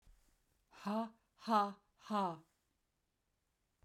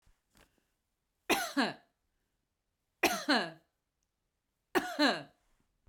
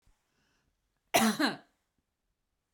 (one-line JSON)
{"exhalation_length": "3.8 s", "exhalation_amplitude": 3029, "exhalation_signal_mean_std_ratio": 0.36, "three_cough_length": "5.9 s", "three_cough_amplitude": 7112, "three_cough_signal_mean_std_ratio": 0.33, "cough_length": "2.7 s", "cough_amplitude": 8514, "cough_signal_mean_std_ratio": 0.29, "survey_phase": "beta (2021-08-13 to 2022-03-07)", "age": "45-64", "gender": "Female", "wearing_mask": "No", "symptom_none": true, "smoker_status": "Ex-smoker", "respiratory_condition_asthma": false, "respiratory_condition_other": false, "recruitment_source": "REACT", "submission_delay": "1 day", "covid_test_result": "Negative", "covid_test_method": "RT-qPCR"}